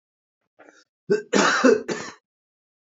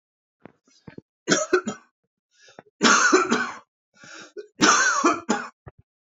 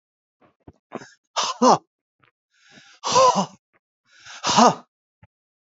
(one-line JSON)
{"cough_length": "2.9 s", "cough_amplitude": 20472, "cough_signal_mean_std_ratio": 0.39, "three_cough_length": "6.1 s", "three_cough_amplitude": 25123, "three_cough_signal_mean_std_ratio": 0.43, "exhalation_length": "5.6 s", "exhalation_amplitude": 26903, "exhalation_signal_mean_std_ratio": 0.33, "survey_phase": "beta (2021-08-13 to 2022-03-07)", "age": "65+", "gender": "Male", "wearing_mask": "No", "symptom_cough_any": true, "symptom_fatigue": true, "symptom_onset": "12 days", "smoker_status": "Never smoked", "respiratory_condition_asthma": false, "respiratory_condition_other": false, "recruitment_source": "REACT", "submission_delay": "2 days", "covid_test_result": "Negative", "covid_test_method": "RT-qPCR", "influenza_a_test_result": "Negative", "influenza_b_test_result": "Negative"}